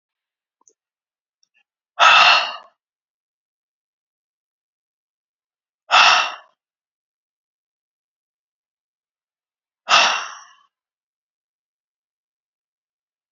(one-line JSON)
{"exhalation_length": "13.3 s", "exhalation_amplitude": 31320, "exhalation_signal_mean_std_ratio": 0.23, "survey_phase": "beta (2021-08-13 to 2022-03-07)", "age": "45-64", "gender": "Male", "wearing_mask": "No", "symptom_cough_any": true, "symptom_new_continuous_cough": true, "symptom_runny_or_blocked_nose": true, "symptom_fatigue": true, "symptom_fever_high_temperature": true, "symptom_headache": true, "symptom_onset": "3 days", "smoker_status": "Never smoked", "respiratory_condition_asthma": false, "respiratory_condition_other": false, "recruitment_source": "Test and Trace", "submission_delay": "2 days", "covid_test_result": "Positive", "covid_test_method": "RT-qPCR", "covid_ct_value": 12.8, "covid_ct_gene": "ORF1ab gene", "covid_ct_mean": 13.2, "covid_viral_load": "47000000 copies/ml", "covid_viral_load_category": "High viral load (>1M copies/ml)"}